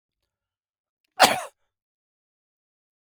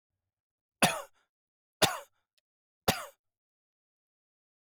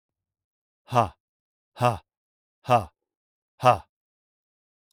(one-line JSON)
{"cough_length": "3.2 s", "cough_amplitude": 28334, "cough_signal_mean_std_ratio": 0.17, "three_cough_length": "4.6 s", "three_cough_amplitude": 10530, "three_cough_signal_mean_std_ratio": 0.21, "exhalation_length": "4.9 s", "exhalation_amplitude": 22295, "exhalation_signal_mean_std_ratio": 0.25, "survey_phase": "alpha (2021-03-01 to 2021-08-12)", "age": "45-64", "gender": "Male", "wearing_mask": "No", "symptom_none": true, "smoker_status": "Ex-smoker", "respiratory_condition_asthma": false, "respiratory_condition_other": false, "recruitment_source": "REACT", "submission_delay": "2 days", "covid_test_result": "Negative", "covid_test_method": "RT-qPCR"}